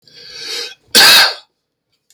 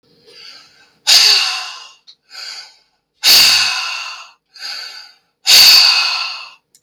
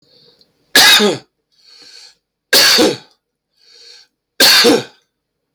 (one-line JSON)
{"cough_length": "2.1 s", "cough_amplitude": 32768, "cough_signal_mean_std_ratio": 0.44, "exhalation_length": "6.8 s", "exhalation_amplitude": 32768, "exhalation_signal_mean_std_ratio": 0.49, "three_cough_length": "5.5 s", "three_cough_amplitude": 32768, "three_cough_signal_mean_std_ratio": 0.44, "survey_phase": "beta (2021-08-13 to 2022-03-07)", "age": "45-64", "gender": "Male", "wearing_mask": "No", "symptom_none": true, "smoker_status": "Ex-smoker", "respiratory_condition_asthma": false, "respiratory_condition_other": false, "recruitment_source": "REACT", "submission_delay": "2 days", "covid_test_result": "Negative", "covid_test_method": "RT-qPCR", "influenza_a_test_result": "Unknown/Void", "influenza_b_test_result": "Unknown/Void"}